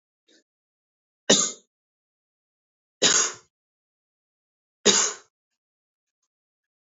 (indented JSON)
{
  "three_cough_length": "6.8 s",
  "three_cough_amplitude": 23824,
  "three_cough_signal_mean_std_ratio": 0.25,
  "survey_phase": "beta (2021-08-13 to 2022-03-07)",
  "age": "18-44",
  "gender": "Male",
  "wearing_mask": "No",
  "symptom_none": true,
  "symptom_onset": "8 days",
  "smoker_status": "Never smoked",
  "respiratory_condition_asthma": false,
  "respiratory_condition_other": false,
  "recruitment_source": "REACT",
  "submission_delay": "1 day",
  "covid_test_result": "Negative",
  "covid_test_method": "RT-qPCR",
  "influenza_a_test_result": "Negative",
  "influenza_b_test_result": "Negative"
}